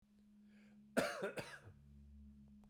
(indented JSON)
{
  "cough_length": "2.7 s",
  "cough_amplitude": 3286,
  "cough_signal_mean_std_ratio": 0.43,
  "survey_phase": "beta (2021-08-13 to 2022-03-07)",
  "age": "45-64",
  "gender": "Male",
  "wearing_mask": "No",
  "symptom_cough_any": true,
  "symptom_shortness_of_breath": true,
  "symptom_fatigue": true,
  "symptom_change_to_sense_of_smell_or_taste": true,
  "symptom_loss_of_taste": true,
  "symptom_onset": "6 days",
  "smoker_status": "Never smoked",
  "respiratory_condition_asthma": false,
  "respiratory_condition_other": false,
  "recruitment_source": "Test and Trace",
  "submission_delay": "2 days",
  "covid_test_result": "Positive",
  "covid_test_method": "RT-qPCR"
}